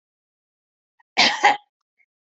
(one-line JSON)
{"cough_length": "2.4 s", "cough_amplitude": 26434, "cough_signal_mean_std_ratio": 0.28, "survey_phase": "beta (2021-08-13 to 2022-03-07)", "age": "65+", "gender": "Female", "wearing_mask": "No", "symptom_runny_or_blocked_nose": true, "smoker_status": "Ex-smoker", "respiratory_condition_asthma": false, "respiratory_condition_other": false, "recruitment_source": "REACT", "submission_delay": "2 days", "covid_test_result": "Negative", "covid_test_method": "RT-qPCR", "influenza_a_test_result": "Negative", "influenza_b_test_result": "Negative"}